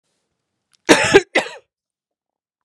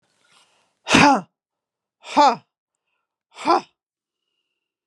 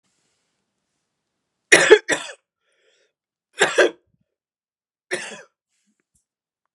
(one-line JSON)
{"cough_length": "2.6 s", "cough_amplitude": 32768, "cough_signal_mean_std_ratio": 0.28, "exhalation_length": "4.9 s", "exhalation_amplitude": 28155, "exhalation_signal_mean_std_ratio": 0.29, "three_cough_length": "6.7 s", "three_cough_amplitude": 32768, "three_cough_signal_mean_std_ratio": 0.22, "survey_phase": "beta (2021-08-13 to 2022-03-07)", "age": "45-64", "gender": "Female", "wearing_mask": "No", "symptom_none": true, "smoker_status": "Ex-smoker", "respiratory_condition_asthma": false, "respiratory_condition_other": false, "recruitment_source": "REACT", "submission_delay": "7 days", "covid_test_result": "Negative", "covid_test_method": "RT-qPCR"}